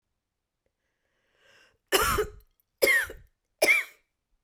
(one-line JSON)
{"three_cough_length": "4.4 s", "three_cough_amplitude": 13547, "three_cough_signal_mean_std_ratio": 0.35, "survey_phase": "beta (2021-08-13 to 2022-03-07)", "age": "45-64", "gender": "Female", "wearing_mask": "No", "symptom_cough_any": true, "smoker_status": "Ex-smoker", "respiratory_condition_asthma": false, "respiratory_condition_other": false, "recruitment_source": "REACT", "submission_delay": "1 day", "covid_test_result": "Negative", "covid_test_method": "RT-qPCR"}